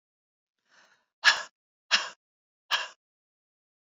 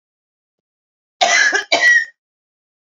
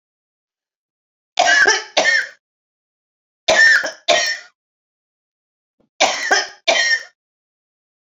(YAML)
exhalation_length: 3.8 s
exhalation_amplitude: 17229
exhalation_signal_mean_std_ratio: 0.23
cough_length: 2.9 s
cough_amplitude: 29653
cough_signal_mean_std_ratio: 0.43
three_cough_length: 8.0 s
three_cough_amplitude: 32767
three_cough_signal_mean_std_ratio: 0.42
survey_phase: beta (2021-08-13 to 2022-03-07)
age: 45-64
gender: Female
wearing_mask: 'No'
symptom_cough_any: true
symptom_onset: 12 days
smoker_status: Never smoked
respiratory_condition_asthma: false
respiratory_condition_other: false
recruitment_source: REACT
submission_delay: 1 day
covid_test_result: Negative
covid_test_method: RT-qPCR
influenza_a_test_result: Negative
influenza_b_test_result: Negative